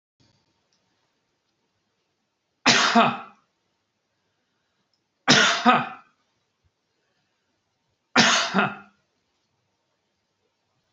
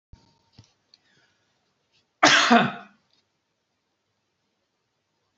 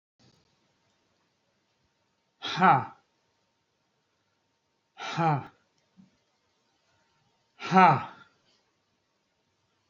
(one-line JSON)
{"three_cough_length": "10.9 s", "three_cough_amplitude": 26795, "three_cough_signal_mean_std_ratio": 0.29, "cough_length": "5.4 s", "cough_amplitude": 27337, "cough_signal_mean_std_ratio": 0.23, "exhalation_length": "9.9 s", "exhalation_amplitude": 19312, "exhalation_signal_mean_std_ratio": 0.23, "survey_phase": "beta (2021-08-13 to 2022-03-07)", "age": "65+", "gender": "Male", "wearing_mask": "No", "symptom_none": true, "smoker_status": "Ex-smoker", "respiratory_condition_asthma": false, "respiratory_condition_other": false, "recruitment_source": "REACT", "submission_delay": "11 days", "covid_test_result": "Negative", "covid_test_method": "RT-qPCR", "influenza_a_test_result": "Negative", "influenza_b_test_result": "Negative"}